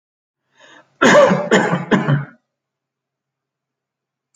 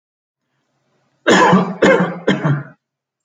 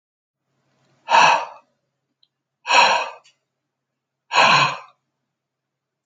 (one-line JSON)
{"cough_length": "4.4 s", "cough_amplitude": 28516, "cough_signal_mean_std_ratio": 0.39, "three_cough_length": "3.2 s", "three_cough_amplitude": 28836, "three_cough_signal_mean_std_ratio": 0.49, "exhalation_length": "6.1 s", "exhalation_amplitude": 27509, "exhalation_signal_mean_std_ratio": 0.35, "survey_phase": "alpha (2021-03-01 to 2021-08-12)", "age": "65+", "gender": "Male", "wearing_mask": "No", "symptom_none": true, "smoker_status": "Ex-smoker", "respiratory_condition_asthma": false, "respiratory_condition_other": false, "recruitment_source": "REACT", "submission_delay": "1 day", "covid_test_result": "Negative", "covid_test_method": "RT-qPCR"}